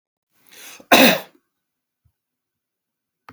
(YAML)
cough_length: 3.3 s
cough_amplitude: 32768
cough_signal_mean_std_ratio: 0.23
survey_phase: beta (2021-08-13 to 2022-03-07)
age: 45-64
gender: Male
wearing_mask: 'No'
symptom_none: true
smoker_status: Never smoked
respiratory_condition_asthma: true
respiratory_condition_other: false
recruitment_source: REACT
submission_delay: 1 day
covid_test_result: Negative
covid_test_method: RT-qPCR
influenza_a_test_result: Negative
influenza_b_test_result: Negative